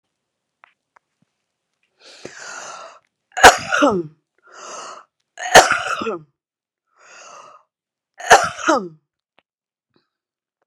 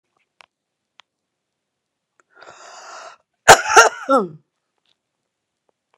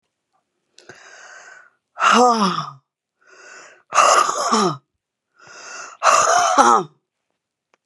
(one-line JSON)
{"three_cough_length": "10.7 s", "three_cough_amplitude": 32768, "three_cough_signal_mean_std_ratio": 0.26, "cough_length": "6.0 s", "cough_amplitude": 32768, "cough_signal_mean_std_ratio": 0.22, "exhalation_length": "7.9 s", "exhalation_amplitude": 32767, "exhalation_signal_mean_std_ratio": 0.45, "survey_phase": "beta (2021-08-13 to 2022-03-07)", "age": "65+", "gender": "Female", "wearing_mask": "No", "symptom_cough_any": true, "symptom_diarrhoea": true, "smoker_status": "Never smoked", "respiratory_condition_asthma": false, "respiratory_condition_other": false, "recruitment_source": "Test and Trace", "submission_delay": "1 day", "covid_test_result": "Positive", "covid_test_method": "RT-qPCR", "covid_ct_value": 29.8, "covid_ct_gene": "ORF1ab gene", "covid_ct_mean": 30.8, "covid_viral_load": "81 copies/ml", "covid_viral_load_category": "Minimal viral load (< 10K copies/ml)"}